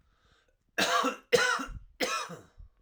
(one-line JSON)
{"three_cough_length": "2.8 s", "three_cough_amplitude": 9916, "three_cough_signal_mean_std_ratio": 0.5, "survey_phase": "alpha (2021-03-01 to 2021-08-12)", "age": "18-44", "gender": "Male", "wearing_mask": "No", "symptom_diarrhoea": true, "smoker_status": "Never smoked", "respiratory_condition_asthma": true, "respiratory_condition_other": false, "recruitment_source": "REACT", "submission_delay": "1 day", "covid_test_result": "Negative", "covid_test_method": "RT-qPCR"}